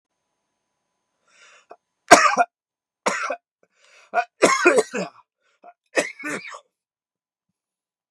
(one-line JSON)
{"three_cough_length": "8.1 s", "three_cough_amplitude": 32768, "three_cough_signal_mean_std_ratio": 0.28, "survey_phase": "beta (2021-08-13 to 2022-03-07)", "age": "45-64", "gender": "Male", "wearing_mask": "No", "symptom_shortness_of_breath": true, "symptom_fatigue": true, "symptom_onset": "4 days", "smoker_status": "Ex-smoker", "respiratory_condition_asthma": false, "respiratory_condition_other": false, "recruitment_source": "Test and Trace", "submission_delay": "2 days", "covid_test_result": "Positive", "covid_test_method": "RT-qPCR", "covid_ct_value": 39.5, "covid_ct_gene": "N gene"}